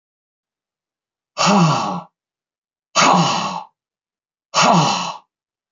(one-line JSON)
{"exhalation_length": "5.7 s", "exhalation_amplitude": 28463, "exhalation_signal_mean_std_ratio": 0.46, "survey_phase": "beta (2021-08-13 to 2022-03-07)", "age": "45-64", "gender": "Male", "wearing_mask": "No", "symptom_none": true, "smoker_status": "Never smoked", "respiratory_condition_asthma": false, "respiratory_condition_other": false, "recruitment_source": "Test and Trace", "submission_delay": "1 day", "covid_test_result": "Negative", "covid_test_method": "RT-qPCR"}